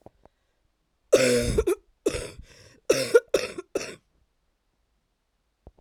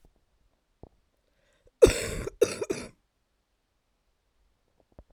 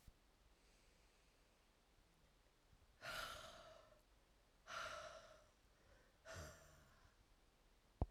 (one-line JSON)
{"three_cough_length": "5.8 s", "three_cough_amplitude": 20075, "three_cough_signal_mean_std_ratio": 0.35, "cough_length": "5.1 s", "cough_amplitude": 22483, "cough_signal_mean_std_ratio": 0.2, "exhalation_length": "8.1 s", "exhalation_amplitude": 1666, "exhalation_signal_mean_std_ratio": 0.42, "survey_phase": "beta (2021-08-13 to 2022-03-07)", "age": "18-44", "gender": "Female", "wearing_mask": "No", "symptom_cough_any": true, "symptom_runny_or_blocked_nose": true, "symptom_shortness_of_breath": true, "symptom_abdominal_pain": true, "symptom_fatigue": true, "symptom_change_to_sense_of_smell_or_taste": true, "symptom_onset": "5 days", "smoker_status": "Ex-smoker", "respiratory_condition_asthma": true, "respiratory_condition_other": false, "recruitment_source": "Test and Trace", "submission_delay": "2 days", "covid_test_result": "Positive", "covid_test_method": "RT-qPCR", "covid_ct_value": 19.9, "covid_ct_gene": "ORF1ab gene", "covid_ct_mean": 20.3, "covid_viral_load": "220000 copies/ml", "covid_viral_load_category": "Low viral load (10K-1M copies/ml)"}